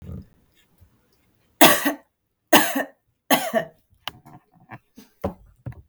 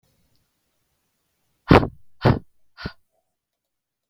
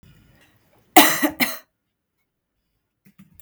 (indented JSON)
{
  "three_cough_length": "5.9 s",
  "three_cough_amplitude": 32768,
  "three_cough_signal_mean_std_ratio": 0.29,
  "exhalation_length": "4.1 s",
  "exhalation_amplitude": 32768,
  "exhalation_signal_mean_std_ratio": 0.2,
  "cough_length": "3.4 s",
  "cough_amplitude": 32768,
  "cough_signal_mean_std_ratio": 0.25,
  "survey_phase": "beta (2021-08-13 to 2022-03-07)",
  "age": "18-44",
  "gender": "Female",
  "wearing_mask": "No",
  "symptom_sore_throat": true,
  "symptom_onset": "12 days",
  "smoker_status": "Never smoked",
  "respiratory_condition_asthma": false,
  "respiratory_condition_other": false,
  "recruitment_source": "REACT",
  "submission_delay": "1 day",
  "covid_test_result": "Negative",
  "covid_test_method": "RT-qPCR"
}